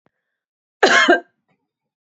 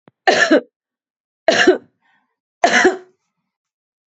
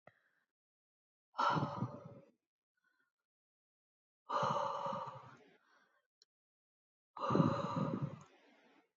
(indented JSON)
{
  "cough_length": "2.1 s",
  "cough_amplitude": 29719,
  "cough_signal_mean_std_ratio": 0.33,
  "three_cough_length": "4.1 s",
  "three_cough_amplitude": 30064,
  "three_cough_signal_mean_std_ratio": 0.38,
  "exhalation_length": "9.0 s",
  "exhalation_amplitude": 3984,
  "exhalation_signal_mean_std_ratio": 0.4,
  "survey_phase": "beta (2021-08-13 to 2022-03-07)",
  "age": "45-64",
  "gender": "Female",
  "wearing_mask": "No",
  "symptom_none": true,
  "smoker_status": "Never smoked",
  "respiratory_condition_asthma": false,
  "respiratory_condition_other": false,
  "recruitment_source": "REACT",
  "submission_delay": "3 days",
  "covid_test_result": "Negative",
  "covid_test_method": "RT-qPCR",
  "influenza_a_test_result": "Negative",
  "influenza_b_test_result": "Negative"
}